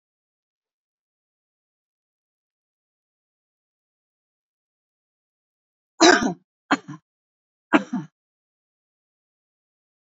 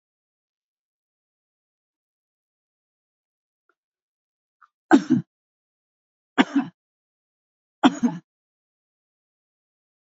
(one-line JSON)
{"cough_length": "10.2 s", "cough_amplitude": 30152, "cough_signal_mean_std_ratio": 0.16, "three_cough_length": "10.2 s", "three_cough_amplitude": 26335, "three_cough_signal_mean_std_ratio": 0.17, "survey_phase": "beta (2021-08-13 to 2022-03-07)", "age": "65+", "gender": "Female", "wearing_mask": "No", "symptom_none": true, "smoker_status": "Never smoked", "respiratory_condition_asthma": false, "respiratory_condition_other": false, "recruitment_source": "REACT", "submission_delay": "2 days", "covid_test_result": "Negative", "covid_test_method": "RT-qPCR", "influenza_a_test_result": "Negative", "influenza_b_test_result": "Negative"}